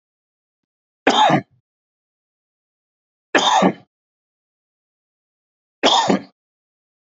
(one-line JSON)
{"three_cough_length": "7.2 s", "three_cough_amplitude": 28276, "three_cough_signal_mean_std_ratio": 0.31, "survey_phase": "beta (2021-08-13 to 2022-03-07)", "age": "45-64", "gender": "Male", "wearing_mask": "No", "symptom_cough_any": true, "symptom_runny_or_blocked_nose": true, "symptom_headache": true, "symptom_onset": "12 days", "smoker_status": "Ex-smoker", "respiratory_condition_asthma": true, "respiratory_condition_other": false, "recruitment_source": "REACT", "submission_delay": "1 day", "covid_test_result": "Negative", "covid_test_method": "RT-qPCR", "influenza_a_test_result": "Negative", "influenza_b_test_result": "Negative"}